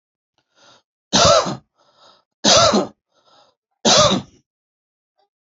{"three_cough_length": "5.5 s", "three_cough_amplitude": 32623, "three_cough_signal_mean_std_ratio": 0.38, "survey_phase": "alpha (2021-03-01 to 2021-08-12)", "age": "45-64", "gender": "Male", "wearing_mask": "No", "symptom_none": true, "smoker_status": "Ex-smoker", "respiratory_condition_asthma": false, "respiratory_condition_other": false, "recruitment_source": "REACT", "submission_delay": "2 days", "covid_test_result": "Negative", "covid_test_method": "RT-qPCR"}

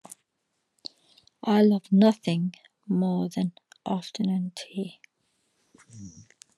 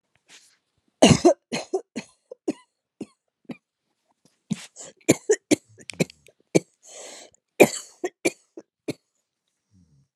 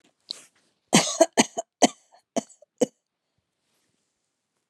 {"exhalation_length": "6.6 s", "exhalation_amplitude": 13322, "exhalation_signal_mean_std_ratio": 0.47, "three_cough_length": "10.2 s", "three_cough_amplitude": 32518, "three_cough_signal_mean_std_ratio": 0.23, "cough_length": "4.7 s", "cough_amplitude": 27413, "cough_signal_mean_std_ratio": 0.23, "survey_phase": "alpha (2021-03-01 to 2021-08-12)", "age": "45-64", "gender": "Female", "wearing_mask": "Yes", "symptom_shortness_of_breath": true, "symptom_diarrhoea": true, "symptom_fatigue": true, "symptom_loss_of_taste": true, "smoker_status": "Never smoked", "respiratory_condition_asthma": false, "respiratory_condition_other": false, "recruitment_source": "REACT", "submission_delay": "1 day", "covid_test_result": "Negative", "covid_test_method": "RT-qPCR"}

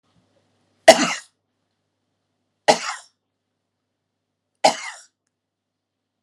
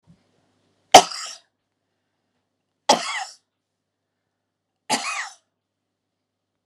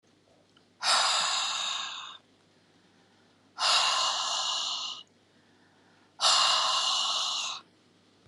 {"cough_length": "6.2 s", "cough_amplitude": 32768, "cough_signal_mean_std_ratio": 0.19, "three_cough_length": "6.7 s", "three_cough_amplitude": 32768, "three_cough_signal_mean_std_ratio": 0.18, "exhalation_length": "8.3 s", "exhalation_amplitude": 11009, "exhalation_signal_mean_std_ratio": 0.6, "survey_phase": "alpha (2021-03-01 to 2021-08-12)", "age": "65+", "gender": "Female", "wearing_mask": "No", "symptom_none": true, "smoker_status": "Never smoked", "respiratory_condition_asthma": false, "respiratory_condition_other": false, "recruitment_source": "Test and Trace", "submission_delay": "0 days", "covid_test_result": "Negative", "covid_test_method": "LFT"}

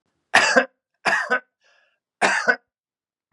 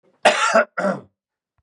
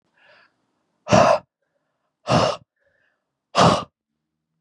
{"three_cough_length": "3.3 s", "three_cough_amplitude": 32743, "three_cough_signal_mean_std_ratio": 0.4, "cough_length": "1.6 s", "cough_amplitude": 31252, "cough_signal_mean_std_ratio": 0.46, "exhalation_length": "4.6 s", "exhalation_amplitude": 30449, "exhalation_signal_mean_std_ratio": 0.33, "survey_phase": "beta (2021-08-13 to 2022-03-07)", "age": "45-64", "gender": "Male", "wearing_mask": "No", "symptom_none": true, "smoker_status": "Ex-smoker", "respiratory_condition_asthma": false, "respiratory_condition_other": false, "recruitment_source": "REACT", "submission_delay": "2 days", "covid_test_result": "Negative", "covid_test_method": "RT-qPCR"}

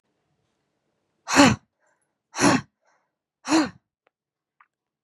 {"exhalation_length": "5.0 s", "exhalation_amplitude": 30668, "exhalation_signal_mean_std_ratio": 0.28, "survey_phase": "beta (2021-08-13 to 2022-03-07)", "age": "18-44", "gender": "Female", "wearing_mask": "No", "symptom_runny_or_blocked_nose": true, "symptom_sore_throat": true, "symptom_headache": true, "smoker_status": "Never smoked", "respiratory_condition_asthma": false, "respiratory_condition_other": false, "recruitment_source": "Test and Trace", "submission_delay": "1 day", "covid_test_result": "Positive", "covid_test_method": "RT-qPCR", "covid_ct_value": 17.5, "covid_ct_gene": "ORF1ab gene", "covid_ct_mean": 18.9, "covid_viral_load": "620000 copies/ml", "covid_viral_load_category": "Low viral load (10K-1M copies/ml)"}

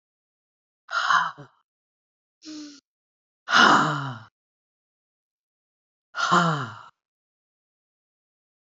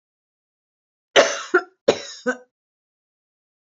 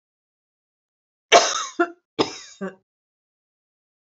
{"exhalation_length": "8.6 s", "exhalation_amplitude": 24974, "exhalation_signal_mean_std_ratio": 0.32, "cough_length": "3.8 s", "cough_amplitude": 27807, "cough_signal_mean_std_ratio": 0.26, "three_cough_length": "4.2 s", "three_cough_amplitude": 29339, "three_cough_signal_mean_std_ratio": 0.25, "survey_phase": "beta (2021-08-13 to 2022-03-07)", "age": "65+", "gender": "Female", "wearing_mask": "No", "symptom_none": true, "smoker_status": "Never smoked", "respiratory_condition_asthma": false, "respiratory_condition_other": false, "recruitment_source": "REACT", "submission_delay": "1 day", "covid_test_result": "Negative", "covid_test_method": "RT-qPCR"}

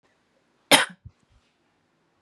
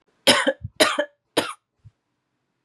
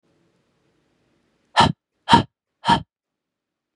{"cough_length": "2.2 s", "cough_amplitude": 32767, "cough_signal_mean_std_ratio": 0.19, "three_cough_length": "2.6 s", "three_cough_amplitude": 28954, "three_cough_signal_mean_std_ratio": 0.35, "exhalation_length": "3.8 s", "exhalation_amplitude": 32768, "exhalation_signal_mean_std_ratio": 0.25, "survey_phase": "beta (2021-08-13 to 2022-03-07)", "age": "18-44", "gender": "Female", "wearing_mask": "No", "symptom_headache": true, "smoker_status": "Never smoked", "respiratory_condition_asthma": false, "respiratory_condition_other": false, "recruitment_source": "REACT", "submission_delay": "2 days", "covid_test_result": "Negative", "covid_test_method": "RT-qPCR", "influenza_a_test_result": "Negative", "influenza_b_test_result": "Negative"}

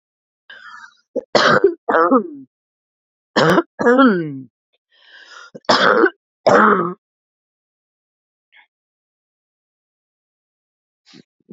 {"three_cough_length": "11.5 s", "three_cough_amplitude": 32767, "three_cough_signal_mean_std_ratio": 0.37, "survey_phase": "beta (2021-08-13 to 2022-03-07)", "age": "18-44", "gender": "Female", "wearing_mask": "No", "symptom_sore_throat": true, "symptom_onset": "8 days", "smoker_status": "Current smoker (e-cigarettes or vapes only)", "respiratory_condition_asthma": false, "respiratory_condition_other": false, "recruitment_source": "REACT", "submission_delay": "18 days", "covid_test_result": "Negative", "covid_test_method": "RT-qPCR", "influenza_a_test_result": "Negative", "influenza_b_test_result": "Negative"}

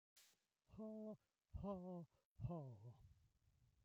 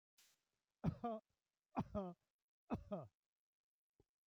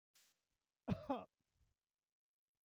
{"exhalation_length": "3.8 s", "exhalation_amplitude": 450, "exhalation_signal_mean_std_ratio": 0.57, "three_cough_length": "4.3 s", "three_cough_amplitude": 1221, "three_cough_signal_mean_std_ratio": 0.33, "cough_length": "2.6 s", "cough_amplitude": 1277, "cough_signal_mean_std_ratio": 0.23, "survey_phase": "beta (2021-08-13 to 2022-03-07)", "age": "65+", "gender": "Male", "wearing_mask": "No", "symptom_none": true, "smoker_status": "Ex-smoker", "respiratory_condition_asthma": false, "respiratory_condition_other": false, "recruitment_source": "REACT", "submission_delay": "0 days", "covid_test_result": "Negative", "covid_test_method": "RT-qPCR", "influenza_a_test_result": "Negative", "influenza_b_test_result": "Negative"}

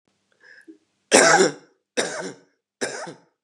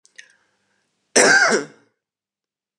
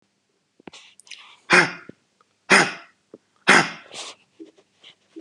{"three_cough_length": "3.4 s", "three_cough_amplitude": 32220, "three_cough_signal_mean_std_ratio": 0.35, "cough_length": "2.8 s", "cough_amplitude": 32768, "cough_signal_mean_std_ratio": 0.34, "exhalation_length": "5.2 s", "exhalation_amplitude": 32528, "exhalation_signal_mean_std_ratio": 0.28, "survey_phase": "beta (2021-08-13 to 2022-03-07)", "age": "18-44", "gender": "Male", "wearing_mask": "No", "symptom_runny_or_blocked_nose": true, "symptom_fatigue": true, "smoker_status": "Never smoked", "respiratory_condition_asthma": false, "respiratory_condition_other": false, "recruitment_source": "REACT", "submission_delay": "1 day", "covid_test_result": "Negative", "covid_test_method": "RT-qPCR", "influenza_a_test_result": "Negative", "influenza_b_test_result": "Negative"}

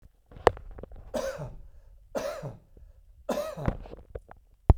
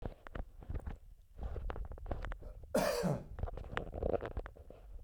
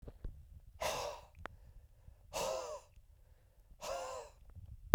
{"three_cough_length": "4.8 s", "three_cough_amplitude": 32767, "three_cough_signal_mean_std_ratio": 0.33, "cough_length": "5.0 s", "cough_amplitude": 16474, "cough_signal_mean_std_ratio": 0.5, "exhalation_length": "4.9 s", "exhalation_amplitude": 17525, "exhalation_signal_mean_std_ratio": 0.24, "survey_phase": "beta (2021-08-13 to 2022-03-07)", "age": "45-64", "gender": "Male", "wearing_mask": "No", "symptom_none": true, "smoker_status": "Ex-smoker", "respiratory_condition_asthma": false, "respiratory_condition_other": false, "recruitment_source": "REACT", "submission_delay": "2 days", "covid_test_result": "Negative", "covid_test_method": "RT-qPCR", "covid_ct_value": 46.0, "covid_ct_gene": "N gene"}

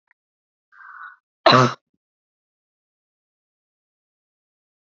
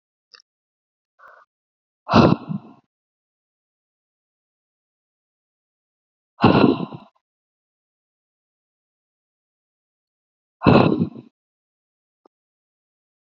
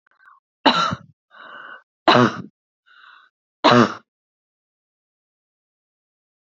{"cough_length": "4.9 s", "cough_amplitude": 29244, "cough_signal_mean_std_ratio": 0.18, "exhalation_length": "13.2 s", "exhalation_amplitude": 29724, "exhalation_signal_mean_std_ratio": 0.22, "three_cough_length": "6.6 s", "three_cough_amplitude": 29812, "three_cough_signal_mean_std_ratio": 0.28, "survey_phase": "beta (2021-08-13 to 2022-03-07)", "age": "18-44", "gender": "Female", "wearing_mask": "No", "symptom_none": true, "smoker_status": "Never smoked", "respiratory_condition_asthma": false, "respiratory_condition_other": false, "recruitment_source": "REACT", "submission_delay": "1 day", "covid_test_result": "Negative", "covid_test_method": "RT-qPCR"}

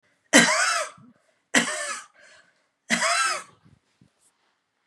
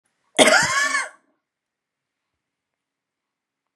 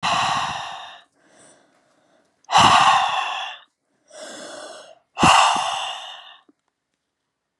{"three_cough_length": "4.9 s", "three_cough_amplitude": 30556, "three_cough_signal_mean_std_ratio": 0.4, "cough_length": "3.8 s", "cough_amplitude": 32767, "cough_signal_mean_std_ratio": 0.31, "exhalation_length": "7.6 s", "exhalation_amplitude": 31067, "exhalation_signal_mean_std_ratio": 0.44, "survey_phase": "beta (2021-08-13 to 2022-03-07)", "age": "45-64", "gender": "Female", "wearing_mask": "No", "symptom_cough_any": true, "symptom_abdominal_pain": true, "smoker_status": "Never smoked", "respiratory_condition_asthma": true, "respiratory_condition_other": false, "recruitment_source": "Test and Trace", "submission_delay": "3 days", "covid_test_result": "Positive", "covid_test_method": "RT-qPCR", "covid_ct_value": 27.9, "covid_ct_gene": "N gene"}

